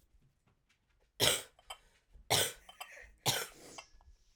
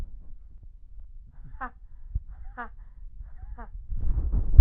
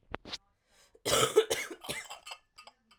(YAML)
three_cough_length: 4.4 s
three_cough_amplitude: 9330
three_cough_signal_mean_std_ratio: 0.33
exhalation_length: 4.6 s
exhalation_amplitude: 32768
exhalation_signal_mean_std_ratio: 0.36
cough_length: 3.0 s
cough_amplitude: 8158
cough_signal_mean_std_ratio: 0.38
survey_phase: alpha (2021-03-01 to 2021-08-12)
age: 18-44
gender: Female
wearing_mask: 'No'
symptom_cough_any: true
symptom_new_continuous_cough: true
symptom_shortness_of_breath: true
symptom_diarrhoea: true
symptom_fatigue: true
smoker_status: Prefer not to say
respiratory_condition_asthma: false
respiratory_condition_other: false
recruitment_source: Test and Trace
submission_delay: 1 day
covid_test_result: Positive
covid_test_method: RT-qPCR
covid_ct_value: 25.3
covid_ct_gene: N gene